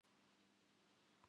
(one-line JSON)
{"cough_length": "1.3 s", "cough_amplitude": 59, "cough_signal_mean_std_ratio": 1.07, "survey_phase": "beta (2021-08-13 to 2022-03-07)", "age": "65+", "gender": "Female", "wearing_mask": "No", "symptom_fatigue": true, "symptom_headache": true, "symptom_onset": "12 days", "smoker_status": "Ex-smoker", "respiratory_condition_asthma": false, "respiratory_condition_other": false, "recruitment_source": "REACT", "submission_delay": "2 days", "covid_test_result": "Negative", "covid_test_method": "RT-qPCR", "influenza_a_test_result": "Negative", "influenza_b_test_result": "Negative"}